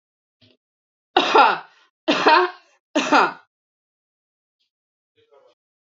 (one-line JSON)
{"three_cough_length": "6.0 s", "three_cough_amplitude": 29656, "three_cough_signal_mean_std_ratio": 0.33, "survey_phase": "beta (2021-08-13 to 2022-03-07)", "age": "18-44", "gender": "Female", "wearing_mask": "No", "symptom_none": true, "smoker_status": "Ex-smoker", "respiratory_condition_asthma": false, "respiratory_condition_other": false, "recruitment_source": "Test and Trace", "submission_delay": "2 days", "covid_test_result": "Positive", "covid_test_method": "LFT"}